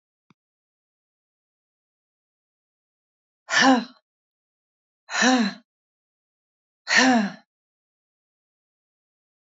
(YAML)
exhalation_length: 9.5 s
exhalation_amplitude: 20953
exhalation_signal_mean_std_ratio: 0.27
survey_phase: beta (2021-08-13 to 2022-03-07)
age: 45-64
gender: Female
wearing_mask: 'No'
symptom_cough_any: true
symptom_fatigue: true
smoker_status: Never smoked
respiratory_condition_asthma: false
respiratory_condition_other: false
recruitment_source: Test and Trace
submission_delay: 3 days
covid_test_result: Positive
covid_test_method: RT-qPCR
covid_ct_value: 17.2
covid_ct_gene: ORF1ab gene
covid_ct_mean: 17.8
covid_viral_load: 1500000 copies/ml
covid_viral_load_category: High viral load (>1M copies/ml)